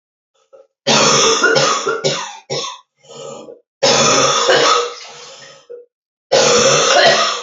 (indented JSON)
{
  "cough_length": "7.4 s",
  "cough_amplitude": 32768,
  "cough_signal_mean_std_ratio": 0.67,
  "survey_phase": "alpha (2021-03-01 to 2021-08-12)",
  "age": "18-44",
  "gender": "Female",
  "wearing_mask": "No",
  "symptom_cough_any": true,
  "symptom_new_continuous_cough": true,
  "symptom_abdominal_pain": true,
  "symptom_fatigue": true,
  "symptom_fever_high_temperature": true,
  "symptom_headache": true,
  "symptom_onset": "2 days",
  "smoker_status": "Never smoked",
  "respiratory_condition_asthma": false,
  "respiratory_condition_other": false,
  "recruitment_source": "Test and Trace",
  "submission_delay": "1 day",
  "covid_test_result": "Positive",
  "covid_test_method": "RT-qPCR"
}